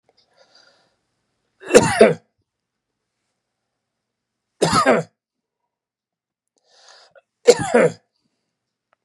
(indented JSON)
{
  "three_cough_length": "9.0 s",
  "three_cough_amplitude": 32768,
  "three_cough_signal_mean_std_ratio": 0.26,
  "survey_phase": "beta (2021-08-13 to 2022-03-07)",
  "age": "45-64",
  "gender": "Male",
  "wearing_mask": "No",
  "symptom_none": true,
  "smoker_status": "Never smoked",
  "respiratory_condition_asthma": false,
  "respiratory_condition_other": false,
  "recruitment_source": "REACT",
  "submission_delay": "2 days",
  "covid_test_result": "Negative",
  "covid_test_method": "RT-qPCR",
  "influenza_a_test_result": "Negative",
  "influenza_b_test_result": "Negative"
}